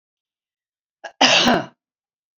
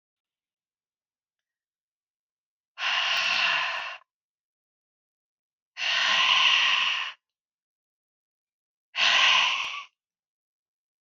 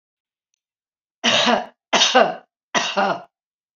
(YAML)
cough_length: 2.4 s
cough_amplitude: 30256
cough_signal_mean_std_ratio: 0.34
exhalation_length: 11.0 s
exhalation_amplitude: 12341
exhalation_signal_mean_std_ratio: 0.44
three_cough_length: 3.8 s
three_cough_amplitude: 27299
three_cough_signal_mean_std_ratio: 0.44
survey_phase: beta (2021-08-13 to 2022-03-07)
age: 65+
gender: Female
wearing_mask: 'No'
symptom_none: true
smoker_status: Never smoked
respiratory_condition_asthma: false
respiratory_condition_other: false
recruitment_source: REACT
submission_delay: 2 days
covid_test_result: Negative
covid_test_method: RT-qPCR